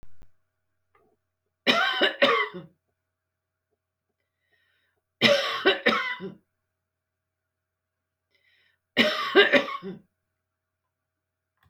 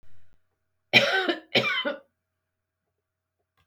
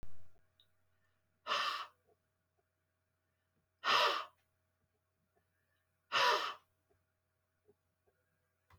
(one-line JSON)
{"three_cough_length": "11.7 s", "three_cough_amplitude": 24488, "three_cough_signal_mean_std_ratio": 0.34, "cough_length": "3.7 s", "cough_amplitude": 22263, "cough_signal_mean_std_ratio": 0.37, "exhalation_length": "8.8 s", "exhalation_amplitude": 3478, "exhalation_signal_mean_std_ratio": 0.32, "survey_phase": "alpha (2021-03-01 to 2021-08-12)", "age": "65+", "gender": "Female", "wearing_mask": "No", "symptom_none": true, "smoker_status": "Ex-smoker", "respiratory_condition_asthma": false, "respiratory_condition_other": false, "recruitment_source": "REACT", "submission_delay": "1 day", "covid_test_result": "Negative", "covid_test_method": "RT-qPCR"}